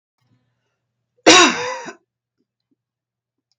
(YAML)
cough_length: 3.6 s
cough_amplitude: 32768
cough_signal_mean_std_ratio: 0.26
survey_phase: beta (2021-08-13 to 2022-03-07)
age: 45-64
gender: Female
wearing_mask: 'No'
symptom_none: true
smoker_status: Never smoked
respiratory_condition_asthma: false
respiratory_condition_other: false
recruitment_source: Test and Trace
submission_delay: 1 day
covid_test_result: Negative
covid_test_method: ePCR